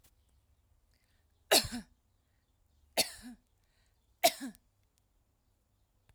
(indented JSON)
{
  "three_cough_length": "6.1 s",
  "three_cough_amplitude": 8548,
  "three_cough_signal_mean_std_ratio": 0.21,
  "survey_phase": "alpha (2021-03-01 to 2021-08-12)",
  "age": "45-64",
  "gender": "Female",
  "wearing_mask": "No",
  "symptom_none": true,
  "smoker_status": "Ex-smoker",
  "respiratory_condition_asthma": false,
  "respiratory_condition_other": false,
  "recruitment_source": "REACT",
  "submission_delay": "1 day",
  "covid_test_result": "Negative",
  "covid_test_method": "RT-qPCR"
}